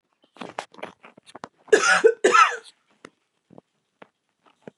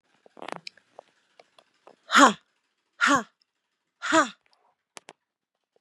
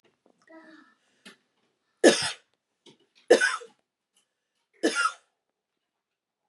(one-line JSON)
{"cough_length": "4.8 s", "cough_amplitude": 25219, "cough_signal_mean_std_ratio": 0.3, "exhalation_length": "5.8 s", "exhalation_amplitude": 29562, "exhalation_signal_mean_std_ratio": 0.24, "three_cough_length": "6.5 s", "three_cough_amplitude": 20461, "three_cough_signal_mean_std_ratio": 0.24, "survey_phase": "beta (2021-08-13 to 2022-03-07)", "age": "45-64", "gender": "Female", "wearing_mask": "No", "symptom_none": true, "smoker_status": "Never smoked", "respiratory_condition_asthma": false, "respiratory_condition_other": false, "recruitment_source": "REACT", "submission_delay": "1 day", "covid_test_result": "Negative", "covid_test_method": "RT-qPCR", "influenza_a_test_result": "Negative", "influenza_b_test_result": "Negative"}